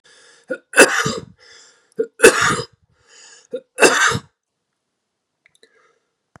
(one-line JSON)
{"three_cough_length": "6.4 s", "three_cough_amplitude": 32768, "three_cough_signal_mean_std_ratio": 0.32, "survey_phase": "beta (2021-08-13 to 2022-03-07)", "age": "45-64", "gender": "Male", "wearing_mask": "No", "symptom_cough_any": true, "symptom_runny_or_blocked_nose": true, "symptom_shortness_of_breath": true, "symptom_sore_throat": true, "symptom_fatigue": true, "symptom_headache": true, "smoker_status": "Ex-smoker", "respiratory_condition_asthma": false, "respiratory_condition_other": false, "recruitment_source": "Test and Trace", "submission_delay": "2 days", "covid_test_result": "Positive", "covid_test_method": "RT-qPCR", "covid_ct_value": 26.3, "covid_ct_gene": "N gene"}